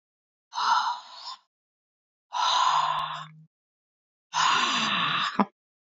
{"exhalation_length": "5.8 s", "exhalation_amplitude": 16309, "exhalation_signal_mean_std_ratio": 0.57, "survey_phase": "beta (2021-08-13 to 2022-03-07)", "age": "45-64", "gender": "Female", "wearing_mask": "No", "symptom_sore_throat": true, "symptom_onset": "3 days", "smoker_status": "Never smoked", "respiratory_condition_asthma": true, "respiratory_condition_other": false, "recruitment_source": "Test and Trace", "submission_delay": "2 days", "covid_test_result": "Positive", "covid_test_method": "RT-qPCR", "covid_ct_value": 25.9, "covid_ct_gene": "ORF1ab gene"}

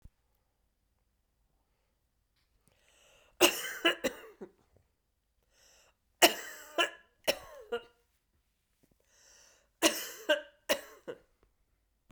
{"three_cough_length": "12.1 s", "three_cough_amplitude": 15446, "three_cough_signal_mean_std_ratio": 0.24, "survey_phase": "beta (2021-08-13 to 2022-03-07)", "age": "65+", "gender": "Female", "wearing_mask": "No", "symptom_none": true, "smoker_status": "Never smoked", "respiratory_condition_asthma": false, "respiratory_condition_other": false, "recruitment_source": "REACT", "submission_delay": "1 day", "covid_test_result": "Negative", "covid_test_method": "RT-qPCR", "influenza_a_test_result": "Negative", "influenza_b_test_result": "Negative"}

